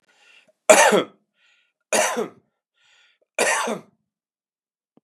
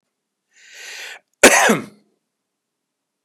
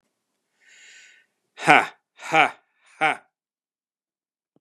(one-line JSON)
{"three_cough_length": "5.0 s", "three_cough_amplitude": 32544, "three_cough_signal_mean_std_ratio": 0.32, "cough_length": "3.2 s", "cough_amplitude": 32768, "cough_signal_mean_std_ratio": 0.27, "exhalation_length": "4.6 s", "exhalation_amplitude": 32767, "exhalation_signal_mean_std_ratio": 0.24, "survey_phase": "beta (2021-08-13 to 2022-03-07)", "age": "45-64", "gender": "Male", "wearing_mask": "No", "symptom_none": true, "symptom_onset": "13 days", "smoker_status": "Current smoker (e-cigarettes or vapes only)", "respiratory_condition_asthma": false, "respiratory_condition_other": false, "recruitment_source": "REACT", "submission_delay": "1 day", "covid_test_result": "Negative", "covid_test_method": "RT-qPCR", "influenza_a_test_result": "Negative", "influenza_b_test_result": "Negative"}